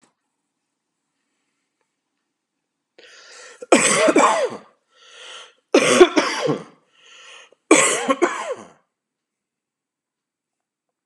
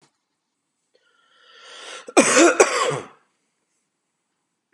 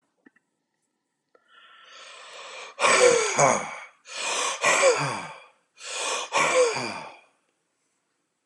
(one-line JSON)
{"three_cough_length": "11.1 s", "three_cough_amplitude": 32767, "three_cough_signal_mean_std_ratio": 0.34, "cough_length": "4.7 s", "cough_amplitude": 32586, "cough_signal_mean_std_ratio": 0.31, "exhalation_length": "8.5 s", "exhalation_amplitude": 20502, "exhalation_signal_mean_std_ratio": 0.48, "survey_phase": "beta (2021-08-13 to 2022-03-07)", "age": "45-64", "gender": "Male", "wearing_mask": "No", "symptom_none": true, "smoker_status": "Ex-smoker", "respiratory_condition_asthma": false, "respiratory_condition_other": false, "recruitment_source": "REACT", "submission_delay": "1 day", "covid_test_result": "Negative", "covid_test_method": "RT-qPCR", "influenza_a_test_result": "Negative", "influenza_b_test_result": "Negative"}